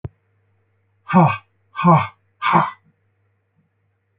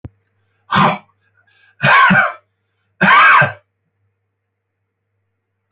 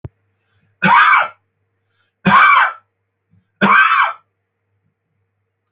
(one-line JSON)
{"exhalation_length": "4.2 s", "exhalation_amplitude": 27623, "exhalation_signal_mean_std_ratio": 0.34, "cough_length": "5.7 s", "cough_amplitude": 32669, "cough_signal_mean_std_ratio": 0.4, "three_cough_length": "5.7 s", "three_cough_amplitude": 29058, "three_cough_signal_mean_std_ratio": 0.43, "survey_phase": "alpha (2021-03-01 to 2021-08-12)", "age": "65+", "gender": "Male", "wearing_mask": "No", "symptom_none": true, "smoker_status": "Ex-smoker", "respiratory_condition_asthma": false, "respiratory_condition_other": false, "recruitment_source": "REACT", "submission_delay": "2 days", "covid_test_result": "Negative", "covid_test_method": "RT-qPCR"}